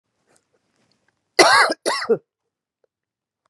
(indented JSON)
{
  "cough_length": "3.5 s",
  "cough_amplitude": 32767,
  "cough_signal_mean_std_ratio": 0.31,
  "survey_phase": "beta (2021-08-13 to 2022-03-07)",
  "age": "45-64",
  "gender": "Female",
  "wearing_mask": "No",
  "symptom_cough_any": true,
  "symptom_runny_or_blocked_nose": true,
  "symptom_abdominal_pain": true,
  "symptom_fatigue": true,
  "symptom_fever_high_temperature": true,
  "symptom_headache": true,
  "symptom_change_to_sense_of_smell_or_taste": true,
  "symptom_loss_of_taste": true,
  "smoker_status": "Never smoked",
  "respiratory_condition_asthma": false,
  "respiratory_condition_other": false,
  "recruitment_source": "Test and Trace",
  "submission_delay": "1 day",
  "covid_test_result": "Positive",
  "covid_test_method": "RT-qPCR",
  "covid_ct_value": 19.2,
  "covid_ct_gene": "N gene"
}